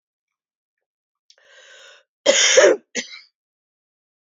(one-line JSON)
{"cough_length": "4.4 s", "cough_amplitude": 30234, "cough_signal_mean_std_ratio": 0.29, "survey_phase": "beta (2021-08-13 to 2022-03-07)", "age": "45-64", "gender": "Female", "wearing_mask": "No", "symptom_cough_any": true, "symptom_runny_or_blocked_nose": true, "symptom_sore_throat": true, "symptom_abdominal_pain": true, "symptom_diarrhoea": true, "symptom_fatigue": true, "symptom_headache": true, "symptom_change_to_sense_of_smell_or_taste": true, "symptom_onset": "5 days", "smoker_status": "Ex-smoker", "respiratory_condition_asthma": true, "respiratory_condition_other": false, "recruitment_source": "Test and Trace", "submission_delay": "2 days", "covid_test_result": "Positive", "covid_test_method": "LAMP"}